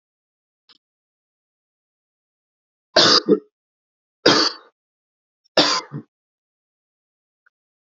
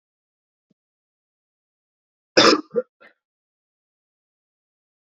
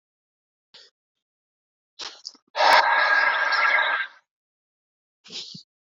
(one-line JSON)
{"three_cough_length": "7.9 s", "three_cough_amplitude": 32767, "three_cough_signal_mean_std_ratio": 0.25, "cough_length": "5.1 s", "cough_amplitude": 29379, "cough_signal_mean_std_ratio": 0.18, "exhalation_length": "5.8 s", "exhalation_amplitude": 20717, "exhalation_signal_mean_std_ratio": 0.44, "survey_phase": "beta (2021-08-13 to 2022-03-07)", "age": "18-44", "gender": "Male", "wearing_mask": "No", "symptom_new_continuous_cough": true, "symptom_sore_throat": true, "symptom_fatigue": true, "symptom_fever_high_temperature": true, "symptom_headache": true, "symptom_onset": "2 days", "smoker_status": "Ex-smoker", "respiratory_condition_asthma": false, "respiratory_condition_other": false, "recruitment_source": "Test and Trace", "submission_delay": "1 day", "covid_test_result": "Positive", "covid_test_method": "RT-qPCR", "covid_ct_value": 22.3, "covid_ct_gene": "N gene"}